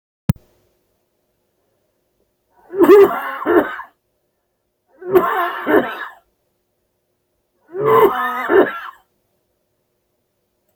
{
  "three_cough_length": "10.8 s",
  "three_cough_amplitude": 28941,
  "three_cough_signal_mean_std_ratio": 0.36,
  "survey_phase": "beta (2021-08-13 to 2022-03-07)",
  "age": "45-64",
  "gender": "Male",
  "wearing_mask": "No",
  "symptom_cough_any": true,
  "symptom_shortness_of_breath": true,
  "symptom_fatigue": true,
  "symptom_onset": "13 days",
  "smoker_status": "Never smoked",
  "respiratory_condition_asthma": false,
  "respiratory_condition_other": false,
  "recruitment_source": "REACT",
  "submission_delay": "2 days",
  "covid_test_result": "Negative",
  "covid_test_method": "RT-qPCR",
  "influenza_a_test_result": "Negative",
  "influenza_b_test_result": "Negative"
}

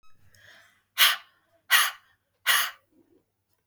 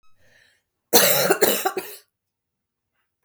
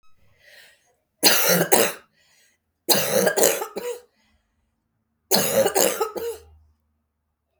{
  "exhalation_length": "3.7 s",
  "exhalation_amplitude": 18855,
  "exhalation_signal_mean_std_ratio": 0.32,
  "cough_length": "3.2 s",
  "cough_amplitude": 32104,
  "cough_signal_mean_std_ratio": 0.38,
  "three_cough_length": "7.6 s",
  "three_cough_amplitude": 32768,
  "three_cough_signal_mean_std_ratio": 0.44,
  "survey_phase": "beta (2021-08-13 to 2022-03-07)",
  "age": "18-44",
  "gender": "Female",
  "wearing_mask": "No",
  "symptom_cough_any": true,
  "symptom_runny_or_blocked_nose": true,
  "symptom_onset": "7 days",
  "smoker_status": "Ex-smoker",
  "respiratory_condition_asthma": true,
  "respiratory_condition_other": false,
  "recruitment_source": "REACT",
  "submission_delay": "1 day",
  "covid_test_result": "Negative",
  "covid_test_method": "RT-qPCR",
  "influenza_a_test_result": "Negative",
  "influenza_b_test_result": "Negative"
}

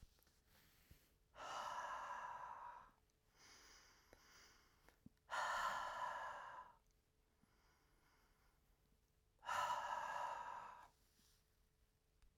{
  "exhalation_length": "12.4 s",
  "exhalation_amplitude": 877,
  "exhalation_signal_mean_std_ratio": 0.51,
  "survey_phase": "alpha (2021-03-01 to 2021-08-12)",
  "age": "65+",
  "gender": "Male",
  "wearing_mask": "No",
  "symptom_none": true,
  "smoker_status": "Never smoked",
  "respiratory_condition_asthma": false,
  "respiratory_condition_other": false,
  "recruitment_source": "REACT",
  "submission_delay": "3 days",
  "covid_test_result": "Negative",
  "covid_test_method": "RT-qPCR"
}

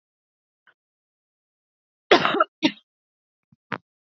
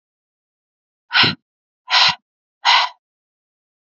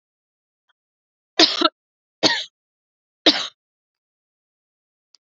{
  "cough_length": "4.0 s",
  "cough_amplitude": 28645,
  "cough_signal_mean_std_ratio": 0.22,
  "exhalation_length": "3.8 s",
  "exhalation_amplitude": 31530,
  "exhalation_signal_mean_std_ratio": 0.33,
  "three_cough_length": "5.3 s",
  "three_cough_amplitude": 32052,
  "three_cough_signal_mean_std_ratio": 0.23,
  "survey_phase": "alpha (2021-03-01 to 2021-08-12)",
  "age": "18-44",
  "gender": "Female",
  "wearing_mask": "Yes",
  "symptom_none": true,
  "smoker_status": "Ex-smoker",
  "respiratory_condition_asthma": false,
  "respiratory_condition_other": false,
  "recruitment_source": "Test and Trace",
  "submission_delay": "1 day",
  "covid_test_result": "Positive",
  "covid_test_method": "RT-qPCR",
  "covid_ct_value": 12.3,
  "covid_ct_gene": "N gene",
  "covid_ct_mean": 12.3,
  "covid_viral_load": "93000000 copies/ml",
  "covid_viral_load_category": "High viral load (>1M copies/ml)"
}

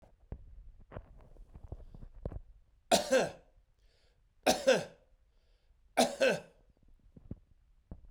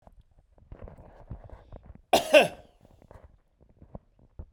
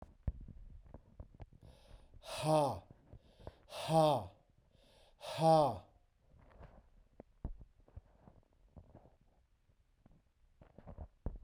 {
  "three_cough_length": "8.1 s",
  "three_cough_amplitude": 8041,
  "three_cough_signal_mean_std_ratio": 0.33,
  "cough_length": "4.5 s",
  "cough_amplitude": 20864,
  "cough_signal_mean_std_ratio": 0.23,
  "exhalation_length": "11.4 s",
  "exhalation_amplitude": 4324,
  "exhalation_signal_mean_std_ratio": 0.33,
  "survey_phase": "beta (2021-08-13 to 2022-03-07)",
  "age": "65+",
  "gender": "Male",
  "wearing_mask": "No",
  "symptom_none": true,
  "smoker_status": "Ex-smoker",
  "respiratory_condition_asthma": false,
  "respiratory_condition_other": false,
  "recruitment_source": "REACT",
  "submission_delay": "2 days",
  "covid_test_result": "Negative",
  "covid_test_method": "RT-qPCR",
  "influenza_a_test_result": "Negative",
  "influenza_b_test_result": "Negative"
}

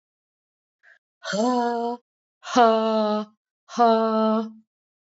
{
  "exhalation_length": "5.1 s",
  "exhalation_amplitude": 21068,
  "exhalation_signal_mean_std_ratio": 0.53,
  "survey_phase": "beta (2021-08-13 to 2022-03-07)",
  "age": "45-64",
  "gender": "Female",
  "wearing_mask": "No",
  "symptom_new_continuous_cough": true,
  "symptom_onset": "4 days",
  "smoker_status": "Never smoked",
  "respiratory_condition_asthma": false,
  "respiratory_condition_other": false,
  "recruitment_source": "Test and Trace",
  "submission_delay": "2 days",
  "covid_test_result": "Negative",
  "covid_test_method": "RT-qPCR"
}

